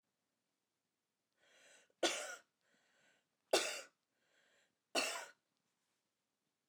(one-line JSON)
{"three_cough_length": "6.7 s", "three_cough_amplitude": 3338, "three_cough_signal_mean_std_ratio": 0.26, "survey_phase": "alpha (2021-03-01 to 2021-08-12)", "age": "65+", "gender": "Female", "wearing_mask": "No", "symptom_none": true, "smoker_status": "Ex-smoker", "respiratory_condition_asthma": false, "respiratory_condition_other": true, "recruitment_source": "REACT", "submission_delay": "2 days", "covid_test_result": "Negative", "covid_test_method": "RT-qPCR"}